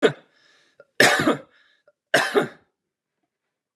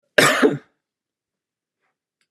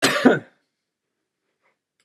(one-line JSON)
{"three_cough_length": "3.8 s", "three_cough_amplitude": 28219, "three_cough_signal_mean_std_ratio": 0.34, "exhalation_length": "2.3 s", "exhalation_amplitude": 32767, "exhalation_signal_mean_std_ratio": 0.3, "cough_length": "2.0 s", "cough_amplitude": 30376, "cough_signal_mean_std_ratio": 0.3, "survey_phase": "beta (2021-08-13 to 2022-03-07)", "age": "45-64", "gender": "Male", "wearing_mask": "No", "symptom_none": true, "symptom_onset": "4 days", "smoker_status": "Never smoked", "respiratory_condition_asthma": false, "respiratory_condition_other": false, "recruitment_source": "REACT", "submission_delay": "3 days", "covid_test_result": "Negative", "covid_test_method": "RT-qPCR", "influenza_a_test_result": "Negative", "influenza_b_test_result": "Negative"}